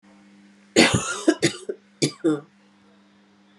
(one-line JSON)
{"three_cough_length": "3.6 s", "three_cough_amplitude": 28948, "three_cough_signal_mean_std_ratio": 0.38, "survey_phase": "beta (2021-08-13 to 2022-03-07)", "age": "45-64", "gender": "Female", "wearing_mask": "No", "symptom_cough_any": true, "symptom_runny_or_blocked_nose": true, "symptom_fatigue": true, "symptom_fever_high_temperature": true, "symptom_headache": true, "symptom_other": true, "smoker_status": "Never smoked", "respiratory_condition_asthma": false, "respiratory_condition_other": false, "recruitment_source": "Test and Trace", "submission_delay": "1 day", "covid_test_result": "Positive", "covid_test_method": "RT-qPCR", "covid_ct_value": 30.8, "covid_ct_gene": "N gene"}